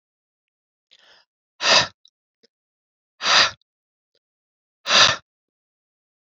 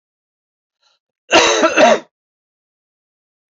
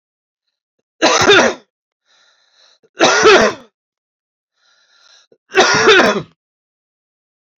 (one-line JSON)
{"exhalation_length": "6.4 s", "exhalation_amplitude": 29237, "exhalation_signal_mean_std_ratio": 0.27, "cough_length": "3.5 s", "cough_amplitude": 29807, "cough_signal_mean_std_ratio": 0.35, "three_cough_length": "7.6 s", "three_cough_amplitude": 32125, "three_cough_signal_mean_std_ratio": 0.39, "survey_phase": "beta (2021-08-13 to 2022-03-07)", "age": "45-64", "gender": "Male", "wearing_mask": "No", "symptom_cough_any": true, "symptom_runny_or_blocked_nose": true, "symptom_fatigue": true, "symptom_headache": true, "symptom_onset": "2 days", "smoker_status": "Ex-smoker", "respiratory_condition_asthma": false, "respiratory_condition_other": false, "recruitment_source": "Test and Trace", "submission_delay": "1 day", "covid_test_result": "Positive", "covid_test_method": "ePCR"}